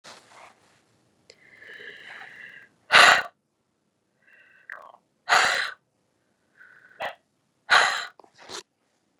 {"exhalation_length": "9.2 s", "exhalation_amplitude": 29648, "exhalation_signal_mean_std_ratio": 0.26, "survey_phase": "beta (2021-08-13 to 2022-03-07)", "age": "45-64", "gender": "Female", "wearing_mask": "No", "symptom_none": true, "smoker_status": "Never smoked", "respiratory_condition_asthma": false, "respiratory_condition_other": false, "recruitment_source": "REACT", "submission_delay": "1 day", "covid_test_result": "Negative", "covid_test_method": "RT-qPCR", "influenza_a_test_result": "Negative", "influenza_b_test_result": "Negative"}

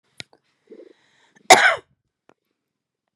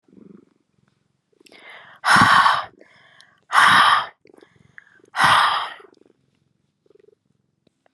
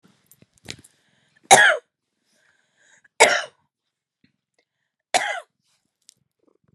{"cough_length": "3.2 s", "cough_amplitude": 32768, "cough_signal_mean_std_ratio": 0.21, "exhalation_length": "7.9 s", "exhalation_amplitude": 28722, "exhalation_signal_mean_std_ratio": 0.37, "three_cough_length": "6.7 s", "three_cough_amplitude": 32768, "three_cough_signal_mean_std_ratio": 0.22, "survey_phase": "beta (2021-08-13 to 2022-03-07)", "age": "18-44", "gender": "Female", "wearing_mask": "No", "symptom_cough_any": true, "symptom_runny_or_blocked_nose": true, "smoker_status": "Current smoker (1 to 10 cigarettes per day)", "respiratory_condition_asthma": false, "respiratory_condition_other": false, "recruitment_source": "Test and Trace", "submission_delay": "0 days", "covid_test_result": "Negative", "covid_test_method": "LFT"}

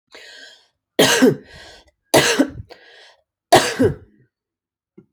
{"three_cough_length": "5.1 s", "three_cough_amplitude": 32397, "three_cough_signal_mean_std_ratio": 0.37, "survey_phase": "beta (2021-08-13 to 2022-03-07)", "age": "45-64", "gender": "Female", "wearing_mask": "No", "symptom_none": true, "smoker_status": "Ex-smoker", "respiratory_condition_asthma": false, "respiratory_condition_other": false, "recruitment_source": "REACT", "submission_delay": "2 days", "covid_test_result": "Negative", "covid_test_method": "RT-qPCR"}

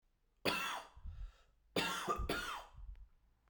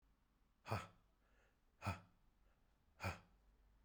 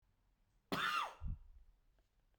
{"three_cough_length": "3.5 s", "three_cough_amplitude": 2950, "three_cough_signal_mean_std_ratio": 0.59, "exhalation_length": "3.8 s", "exhalation_amplitude": 1176, "exhalation_signal_mean_std_ratio": 0.33, "cough_length": "2.4 s", "cough_amplitude": 1469, "cough_signal_mean_std_ratio": 0.43, "survey_phase": "beta (2021-08-13 to 2022-03-07)", "age": "18-44", "gender": "Male", "wearing_mask": "No", "symptom_shortness_of_breath": true, "symptom_fatigue": true, "symptom_fever_high_temperature": true, "symptom_headache": true, "symptom_other": true, "smoker_status": "Never smoked", "respiratory_condition_asthma": false, "respiratory_condition_other": false, "recruitment_source": "Test and Trace", "submission_delay": "2 days", "covid_test_result": "Positive", "covid_test_method": "LFT"}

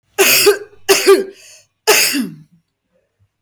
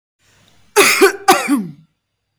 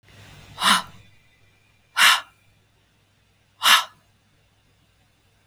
{"three_cough_length": "3.4 s", "three_cough_amplitude": 32766, "three_cough_signal_mean_std_ratio": 0.49, "cough_length": "2.4 s", "cough_amplitude": 32768, "cough_signal_mean_std_ratio": 0.45, "exhalation_length": "5.5 s", "exhalation_amplitude": 28705, "exhalation_signal_mean_std_ratio": 0.28, "survey_phase": "beta (2021-08-13 to 2022-03-07)", "age": "18-44", "gender": "Female", "wearing_mask": "Yes", "symptom_none": true, "smoker_status": "Never smoked", "respiratory_condition_asthma": false, "respiratory_condition_other": false, "recruitment_source": "REACT", "submission_delay": "2 days", "covid_test_result": "Negative", "covid_test_method": "RT-qPCR", "influenza_a_test_result": "Negative", "influenza_b_test_result": "Negative"}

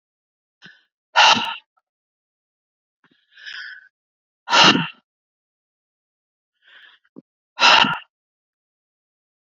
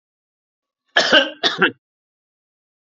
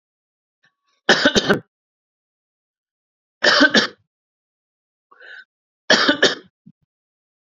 {"exhalation_length": "9.5 s", "exhalation_amplitude": 32101, "exhalation_signal_mean_std_ratio": 0.26, "cough_length": "2.8 s", "cough_amplitude": 28618, "cough_signal_mean_std_ratio": 0.32, "three_cough_length": "7.4 s", "three_cough_amplitude": 32768, "three_cough_signal_mean_std_ratio": 0.31, "survey_phase": "beta (2021-08-13 to 2022-03-07)", "age": "45-64", "gender": "Male", "wearing_mask": "No", "symptom_none": true, "smoker_status": "Never smoked", "respiratory_condition_asthma": false, "respiratory_condition_other": false, "recruitment_source": "REACT", "submission_delay": "10 days", "covid_test_result": "Negative", "covid_test_method": "RT-qPCR", "influenza_a_test_result": "Negative", "influenza_b_test_result": "Negative"}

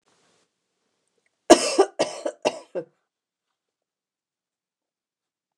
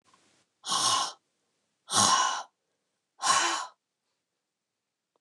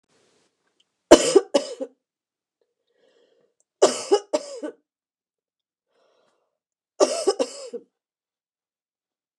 {"cough_length": "5.6 s", "cough_amplitude": 29204, "cough_signal_mean_std_ratio": 0.2, "exhalation_length": "5.2 s", "exhalation_amplitude": 12779, "exhalation_signal_mean_std_ratio": 0.41, "three_cough_length": "9.4 s", "three_cough_amplitude": 29204, "three_cough_signal_mean_std_ratio": 0.23, "survey_phase": "beta (2021-08-13 to 2022-03-07)", "age": "65+", "gender": "Female", "wearing_mask": "No", "symptom_none": true, "smoker_status": "Never smoked", "respiratory_condition_asthma": false, "respiratory_condition_other": false, "recruitment_source": "REACT", "submission_delay": "2 days", "covid_test_result": "Negative", "covid_test_method": "RT-qPCR", "influenza_a_test_result": "Negative", "influenza_b_test_result": "Negative"}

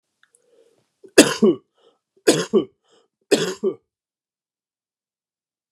{"three_cough_length": "5.7 s", "three_cough_amplitude": 32768, "three_cough_signal_mean_std_ratio": 0.27, "survey_phase": "beta (2021-08-13 to 2022-03-07)", "age": "18-44", "gender": "Male", "wearing_mask": "No", "symptom_cough_any": true, "symptom_runny_or_blocked_nose": true, "symptom_sore_throat": true, "symptom_fatigue": true, "symptom_fever_high_temperature": true, "symptom_headache": true, "symptom_onset": "3 days", "smoker_status": "Never smoked", "respiratory_condition_asthma": false, "respiratory_condition_other": false, "recruitment_source": "Test and Trace", "submission_delay": "2 days", "covid_test_result": "Positive", "covid_test_method": "RT-qPCR", "covid_ct_value": 14.4, "covid_ct_gene": "S gene"}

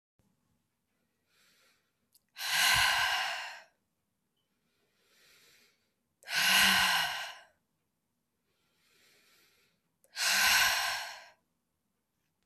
{"exhalation_length": "12.5 s", "exhalation_amplitude": 8000, "exhalation_signal_mean_std_ratio": 0.39, "survey_phase": "beta (2021-08-13 to 2022-03-07)", "age": "18-44", "gender": "Female", "wearing_mask": "No", "symptom_runny_or_blocked_nose": true, "smoker_status": "Never smoked", "respiratory_condition_asthma": false, "respiratory_condition_other": false, "recruitment_source": "Test and Trace", "submission_delay": "1 day", "covid_test_result": "Positive", "covid_test_method": "LFT"}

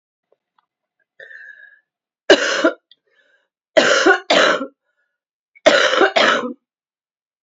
{"three_cough_length": "7.4 s", "three_cough_amplitude": 32223, "three_cough_signal_mean_std_ratio": 0.4, "survey_phase": "beta (2021-08-13 to 2022-03-07)", "age": "45-64", "gender": "Female", "wearing_mask": "No", "symptom_cough_any": true, "symptom_new_continuous_cough": true, "symptom_runny_or_blocked_nose": true, "symptom_shortness_of_breath": true, "symptom_abdominal_pain": true, "symptom_fatigue": true, "symptom_change_to_sense_of_smell_or_taste": true, "symptom_loss_of_taste": true, "symptom_onset": "8 days", "smoker_status": "Never smoked", "respiratory_condition_asthma": true, "respiratory_condition_other": false, "recruitment_source": "Test and Trace", "submission_delay": "2 days", "covid_test_result": "Positive", "covid_test_method": "RT-qPCR", "covid_ct_value": 17.3, "covid_ct_gene": "ORF1ab gene"}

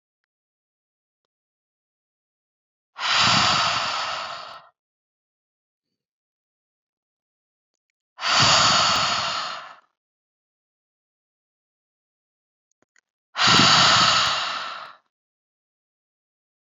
{"exhalation_length": "16.6 s", "exhalation_amplitude": 23389, "exhalation_signal_mean_std_ratio": 0.38, "survey_phase": "beta (2021-08-13 to 2022-03-07)", "age": "45-64", "gender": "Female", "wearing_mask": "No", "symptom_none": true, "smoker_status": "Never smoked", "respiratory_condition_asthma": false, "respiratory_condition_other": false, "recruitment_source": "REACT", "submission_delay": "0 days", "covid_test_result": "Negative", "covid_test_method": "RT-qPCR", "influenza_a_test_result": "Negative", "influenza_b_test_result": "Negative"}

